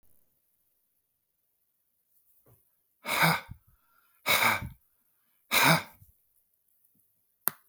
{
  "exhalation_length": "7.7 s",
  "exhalation_amplitude": 25244,
  "exhalation_signal_mean_std_ratio": 0.29,
  "survey_phase": "alpha (2021-03-01 to 2021-08-12)",
  "age": "45-64",
  "gender": "Male",
  "wearing_mask": "No",
  "symptom_none": true,
  "smoker_status": "Ex-smoker",
  "respiratory_condition_asthma": false,
  "respiratory_condition_other": false,
  "recruitment_source": "REACT",
  "submission_delay": "5 days",
  "covid_test_result": "Negative",
  "covid_test_method": "RT-qPCR"
}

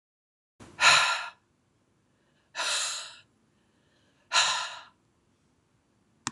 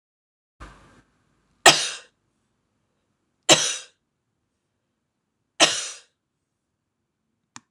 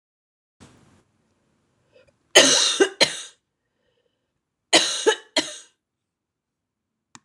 {
  "exhalation_length": "6.3 s",
  "exhalation_amplitude": 14449,
  "exhalation_signal_mean_std_ratio": 0.33,
  "three_cough_length": "7.7 s",
  "three_cough_amplitude": 26028,
  "three_cough_signal_mean_std_ratio": 0.2,
  "cough_length": "7.2 s",
  "cough_amplitude": 26028,
  "cough_signal_mean_std_ratio": 0.29,
  "survey_phase": "beta (2021-08-13 to 2022-03-07)",
  "age": "45-64",
  "gender": "Female",
  "wearing_mask": "No",
  "symptom_cough_any": true,
  "symptom_runny_or_blocked_nose": true,
  "symptom_sore_throat": true,
  "symptom_fatigue": true,
  "symptom_headache": true,
  "symptom_loss_of_taste": true,
  "smoker_status": "Never smoked",
  "respiratory_condition_asthma": false,
  "respiratory_condition_other": false,
  "recruitment_source": "Test and Trace",
  "submission_delay": "2 days",
  "covid_test_result": "Positive",
  "covid_test_method": "RT-qPCR",
  "covid_ct_value": 26.4,
  "covid_ct_gene": "ORF1ab gene"
}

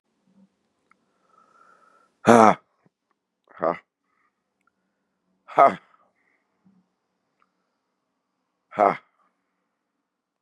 {
  "exhalation_length": "10.4 s",
  "exhalation_amplitude": 32767,
  "exhalation_signal_mean_std_ratio": 0.18,
  "survey_phase": "beta (2021-08-13 to 2022-03-07)",
  "age": "45-64",
  "gender": "Male",
  "wearing_mask": "No",
  "symptom_cough_any": true,
  "symptom_sore_throat": true,
  "symptom_fatigue": true,
  "smoker_status": "Ex-smoker",
  "respiratory_condition_asthma": false,
  "respiratory_condition_other": false,
  "recruitment_source": "Test and Trace",
  "submission_delay": "1 day",
  "covid_test_result": "Positive",
  "covid_test_method": "LFT"
}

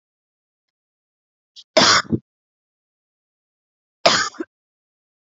{
  "cough_length": "5.3 s",
  "cough_amplitude": 32768,
  "cough_signal_mean_std_ratio": 0.25,
  "survey_phase": "alpha (2021-03-01 to 2021-08-12)",
  "age": "18-44",
  "gender": "Female",
  "wearing_mask": "No",
  "symptom_none": true,
  "symptom_onset": "6 days",
  "smoker_status": "Ex-smoker",
  "respiratory_condition_asthma": false,
  "respiratory_condition_other": false,
  "recruitment_source": "REACT",
  "submission_delay": "3 days",
  "covid_test_result": "Negative",
  "covid_test_method": "RT-qPCR"
}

